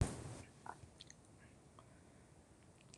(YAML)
cough_length: 3.0 s
cough_amplitude: 2551
cough_signal_mean_std_ratio: 0.37
survey_phase: beta (2021-08-13 to 2022-03-07)
age: 65+
gender: Female
wearing_mask: 'No'
symptom_none: true
smoker_status: Never smoked
respiratory_condition_asthma: true
respiratory_condition_other: false
recruitment_source: REACT
submission_delay: 2 days
covid_test_result: Negative
covid_test_method: RT-qPCR
influenza_a_test_result: Negative
influenza_b_test_result: Negative